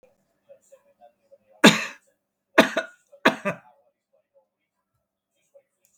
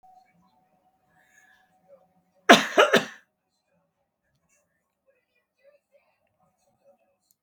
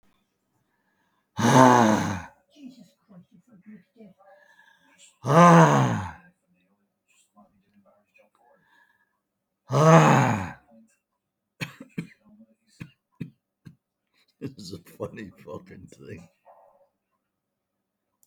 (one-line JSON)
{"three_cough_length": "6.0 s", "three_cough_amplitude": 32768, "three_cough_signal_mean_std_ratio": 0.2, "cough_length": "7.4 s", "cough_amplitude": 32768, "cough_signal_mean_std_ratio": 0.17, "exhalation_length": "18.3 s", "exhalation_amplitude": 32766, "exhalation_signal_mean_std_ratio": 0.29, "survey_phase": "beta (2021-08-13 to 2022-03-07)", "age": "65+", "gender": "Male", "wearing_mask": "No", "symptom_none": true, "smoker_status": "Ex-smoker", "respiratory_condition_asthma": false, "respiratory_condition_other": false, "recruitment_source": "REACT", "submission_delay": "2 days", "covid_test_result": "Negative", "covid_test_method": "RT-qPCR", "influenza_a_test_result": "Negative", "influenza_b_test_result": "Negative"}